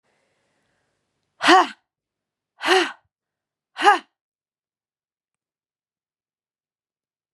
{
  "exhalation_length": "7.3 s",
  "exhalation_amplitude": 31723,
  "exhalation_signal_mean_std_ratio": 0.22,
  "survey_phase": "beta (2021-08-13 to 2022-03-07)",
  "age": "45-64",
  "gender": "Female",
  "wearing_mask": "No",
  "symptom_cough_any": true,
  "symptom_runny_or_blocked_nose": true,
  "smoker_status": "Never smoked",
  "respiratory_condition_asthma": false,
  "respiratory_condition_other": false,
  "recruitment_source": "Test and Trace",
  "submission_delay": "1 day",
  "covid_test_result": "Positive",
  "covid_test_method": "RT-qPCR",
  "covid_ct_value": 30.2,
  "covid_ct_gene": "N gene"
}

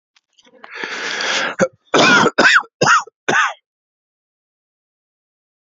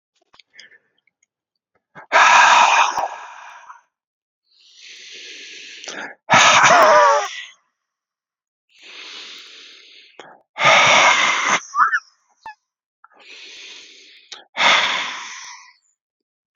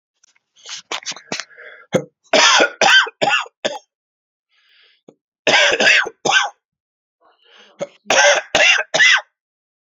{
  "cough_length": "5.6 s",
  "cough_amplitude": 32767,
  "cough_signal_mean_std_ratio": 0.44,
  "exhalation_length": "16.6 s",
  "exhalation_amplitude": 31029,
  "exhalation_signal_mean_std_ratio": 0.42,
  "three_cough_length": "10.0 s",
  "three_cough_amplitude": 32767,
  "three_cough_signal_mean_std_ratio": 0.44,
  "survey_phase": "beta (2021-08-13 to 2022-03-07)",
  "age": "18-44",
  "gender": "Male",
  "wearing_mask": "No",
  "symptom_cough_any": true,
  "symptom_runny_or_blocked_nose": true,
  "symptom_headache": true,
  "symptom_change_to_sense_of_smell_or_taste": true,
  "symptom_loss_of_taste": true,
  "symptom_onset": "3 days",
  "smoker_status": "Never smoked",
  "respiratory_condition_asthma": false,
  "respiratory_condition_other": false,
  "recruitment_source": "Test and Trace",
  "submission_delay": "2 days",
  "covid_test_result": "Positive",
  "covid_test_method": "RT-qPCR",
  "covid_ct_value": 17.9,
  "covid_ct_gene": "ORF1ab gene",
  "covid_ct_mean": 18.6,
  "covid_viral_load": "810000 copies/ml",
  "covid_viral_load_category": "Low viral load (10K-1M copies/ml)"
}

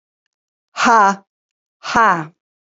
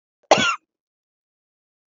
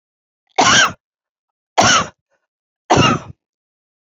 {
  "exhalation_length": "2.6 s",
  "exhalation_amplitude": 28511,
  "exhalation_signal_mean_std_ratio": 0.4,
  "cough_length": "1.9 s",
  "cough_amplitude": 28079,
  "cough_signal_mean_std_ratio": 0.25,
  "three_cough_length": "4.0 s",
  "three_cough_amplitude": 32768,
  "three_cough_signal_mean_std_ratio": 0.39,
  "survey_phase": "beta (2021-08-13 to 2022-03-07)",
  "age": "45-64",
  "gender": "Female",
  "wearing_mask": "No",
  "symptom_runny_or_blocked_nose": true,
  "smoker_status": "Ex-smoker",
  "respiratory_condition_asthma": false,
  "respiratory_condition_other": false,
  "recruitment_source": "REACT",
  "submission_delay": "1 day",
  "covid_test_result": "Negative",
  "covid_test_method": "RT-qPCR",
  "influenza_a_test_result": "Negative",
  "influenza_b_test_result": "Negative"
}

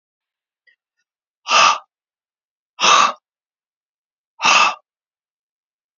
{
  "exhalation_length": "6.0 s",
  "exhalation_amplitude": 29562,
  "exhalation_signal_mean_std_ratio": 0.31,
  "survey_phase": "beta (2021-08-13 to 2022-03-07)",
  "age": "45-64",
  "gender": "Male",
  "wearing_mask": "No",
  "symptom_none": true,
  "smoker_status": "Never smoked",
  "respiratory_condition_asthma": false,
  "respiratory_condition_other": false,
  "recruitment_source": "REACT",
  "submission_delay": "2 days",
  "covid_test_result": "Negative",
  "covid_test_method": "RT-qPCR"
}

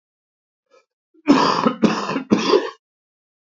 {
  "three_cough_length": "3.4 s",
  "three_cough_amplitude": 27622,
  "three_cough_signal_mean_std_ratio": 0.45,
  "survey_phase": "beta (2021-08-13 to 2022-03-07)",
  "age": "45-64",
  "gender": "Male",
  "wearing_mask": "No",
  "symptom_runny_or_blocked_nose": true,
  "symptom_shortness_of_breath": true,
  "symptom_onset": "2 days",
  "smoker_status": "Ex-smoker",
  "respiratory_condition_asthma": true,
  "respiratory_condition_other": true,
  "recruitment_source": "Test and Trace",
  "submission_delay": "2 days",
  "covid_test_result": "Positive",
  "covid_test_method": "RT-qPCR"
}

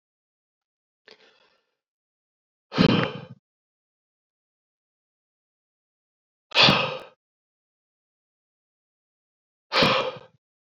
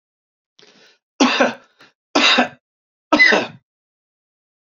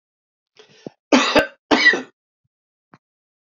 {
  "exhalation_length": "10.8 s",
  "exhalation_amplitude": 23095,
  "exhalation_signal_mean_std_ratio": 0.24,
  "three_cough_length": "4.8 s",
  "three_cough_amplitude": 32767,
  "three_cough_signal_mean_std_ratio": 0.36,
  "cough_length": "3.5 s",
  "cough_amplitude": 29082,
  "cough_signal_mean_std_ratio": 0.32,
  "survey_phase": "beta (2021-08-13 to 2022-03-07)",
  "age": "45-64",
  "gender": "Male",
  "wearing_mask": "No",
  "symptom_none": true,
  "smoker_status": "Never smoked",
  "respiratory_condition_asthma": false,
  "respiratory_condition_other": false,
  "recruitment_source": "REACT",
  "submission_delay": "2 days",
  "covid_test_result": "Negative",
  "covid_test_method": "RT-qPCR"
}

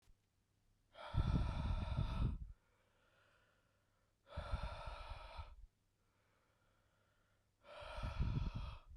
{
  "exhalation_length": "9.0 s",
  "exhalation_amplitude": 1929,
  "exhalation_signal_mean_std_ratio": 0.49,
  "survey_phase": "beta (2021-08-13 to 2022-03-07)",
  "age": "18-44",
  "gender": "Male",
  "wearing_mask": "No",
  "symptom_runny_or_blocked_nose": true,
  "symptom_fatigue": true,
  "symptom_headache": true,
  "symptom_loss_of_taste": true,
  "symptom_onset": "2 days",
  "smoker_status": "Never smoked",
  "respiratory_condition_asthma": false,
  "respiratory_condition_other": true,
  "recruitment_source": "Test and Trace",
  "submission_delay": "1 day",
  "covid_test_result": "Positive",
  "covid_test_method": "ePCR"
}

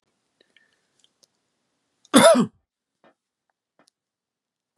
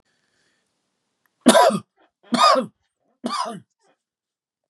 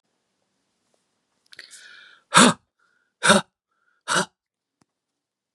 {
  "cough_length": "4.8 s",
  "cough_amplitude": 32767,
  "cough_signal_mean_std_ratio": 0.21,
  "three_cough_length": "4.7 s",
  "three_cough_amplitude": 32767,
  "three_cough_signal_mean_std_ratio": 0.32,
  "exhalation_length": "5.5 s",
  "exhalation_amplitude": 31885,
  "exhalation_signal_mean_std_ratio": 0.23,
  "survey_phase": "beta (2021-08-13 to 2022-03-07)",
  "age": "65+",
  "gender": "Male",
  "wearing_mask": "No",
  "symptom_none": true,
  "smoker_status": "Never smoked",
  "respiratory_condition_asthma": false,
  "respiratory_condition_other": false,
  "recruitment_source": "REACT",
  "submission_delay": "2 days",
  "covid_test_result": "Negative",
  "covid_test_method": "RT-qPCR"
}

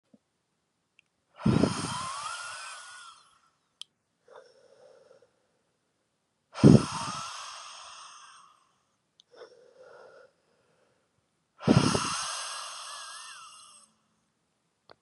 {
  "exhalation_length": "15.0 s",
  "exhalation_amplitude": 22518,
  "exhalation_signal_mean_std_ratio": 0.27,
  "survey_phase": "beta (2021-08-13 to 2022-03-07)",
  "age": "18-44",
  "gender": "Male",
  "wearing_mask": "No",
  "symptom_sore_throat": true,
  "symptom_onset": "3 days",
  "smoker_status": "Current smoker (1 to 10 cigarettes per day)",
  "respiratory_condition_asthma": false,
  "respiratory_condition_other": false,
  "recruitment_source": "Test and Trace",
  "submission_delay": "2 days",
  "covid_test_result": "Positive",
  "covid_test_method": "RT-qPCR",
  "covid_ct_value": 25.0,
  "covid_ct_gene": "N gene"
}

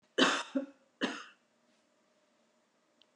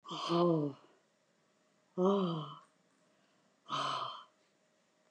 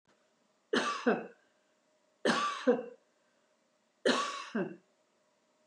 {
  "cough_length": "3.2 s",
  "cough_amplitude": 8216,
  "cough_signal_mean_std_ratio": 0.3,
  "exhalation_length": "5.1 s",
  "exhalation_amplitude": 3383,
  "exhalation_signal_mean_std_ratio": 0.45,
  "three_cough_length": "5.7 s",
  "three_cough_amplitude": 6322,
  "three_cough_signal_mean_std_ratio": 0.4,
  "survey_phase": "beta (2021-08-13 to 2022-03-07)",
  "age": "65+",
  "gender": "Female",
  "wearing_mask": "No",
  "symptom_none": true,
  "smoker_status": "Never smoked",
  "respiratory_condition_asthma": false,
  "respiratory_condition_other": false,
  "recruitment_source": "REACT",
  "submission_delay": "1 day",
  "covid_test_result": "Negative",
  "covid_test_method": "RT-qPCR",
  "influenza_a_test_result": "Negative",
  "influenza_b_test_result": "Negative"
}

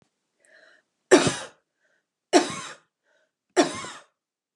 {
  "three_cough_length": "4.6 s",
  "three_cough_amplitude": 25294,
  "three_cough_signal_mean_std_ratio": 0.27,
  "survey_phase": "beta (2021-08-13 to 2022-03-07)",
  "age": "45-64",
  "gender": "Female",
  "wearing_mask": "No",
  "symptom_runny_or_blocked_nose": true,
  "smoker_status": "Never smoked",
  "respiratory_condition_asthma": false,
  "respiratory_condition_other": false,
  "recruitment_source": "REACT",
  "submission_delay": "1 day",
  "covid_test_result": "Negative",
  "covid_test_method": "RT-qPCR",
  "influenza_a_test_result": "Negative",
  "influenza_b_test_result": "Negative"
}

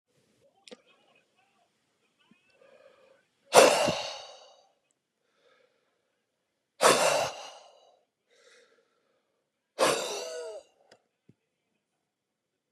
{
  "exhalation_length": "12.7 s",
  "exhalation_amplitude": 24227,
  "exhalation_signal_mean_std_ratio": 0.25,
  "survey_phase": "beta (2021-08-13 to 2022-03-07)",
  "age": "65+",
  "gender": "Male",
  "wearing_mask": "No",
  "symptom_none": true,
  "smoker_status": "Ex-smoker",
  "respiratory_condition_asthma": false,
  "respiratory_condition_other": false,
  "recruitment_source": "REACT",
  "submission_delay": "1 day",
  "covid_test_result": "Negative",
  "covid_test_method": "RT-qPCR",
  "influenza_a_test_result": "Unknown/Void",
  "influenza_b_test_result": "Unknown/Void"
}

